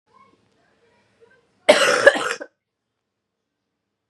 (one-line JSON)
{"cough_length": "4.1 s", "cough_amplitude": 32768, "cough_signal_mean_std_ratio": 0.26, "survey_phase": "beta (2021-08-13 to 2022-03-07)", "age": "18-44", "gender": "Female", "wearing_mask": "No", "symptom_cough_any": true, "symptom_runny_or_blocked_nose": true, "symptom_sore_throat": true, "symptom_fatigue": true, "symptom_fever_high_temperature": true, "symptom_change_to_sense_of_smell_or_taste": true, "symptom_loss_of_taste": true, "symptom_onset": "3 days", "smoker_status": "Never smoked", "respiratory_condition_asthma": false, "respiratory_condition_other": false, "recruitment_source": "Test and Trace", "submission_delay": "2 days", "covid_test_result": "Positive", "covid_test_method": "RT-qPCR", "covid_ct_value": 33.8, "covid_ct_gene": "N gene"}